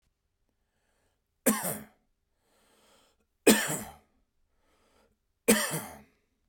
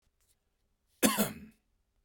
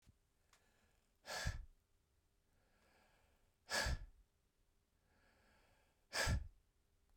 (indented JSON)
{
  "three_cough_length": "6.5 s",
  "three_cough_amplitude": 15897,
  "three_cough_signal_mean_std_ratio": 0.26,
  "cough_length": "2.0 s",
  "cough_amplitude": 10172,
  "cough_signal_mean_std_ratio": 0.28,
  "exhalation_length": "7.2 s",
  "exhalation_amplitude": 1519,
  "exhalation_signal_mean_std_ratio": 0.32,
  "survey_phase": "beta (2021-08-13 to 2022-03-07)",
  "age": "45-64",
  "gender": "Male",
  "wearing_mask": "No",
  "symptom_none": true,
  "smoker_status": "Never smoked",
  "respiratory_condition_asthma": false,
  "respiratory_condition_other": false,
  "recruitment_source": "REACT",
  "submission_delay": "1 day",
  "covid_test_result": "Negative",
  "covid_test_method": "RT-qPCR",
  "influenza_a_test_result": "Negative",
  "influenza_b_test_result": "Negative"
}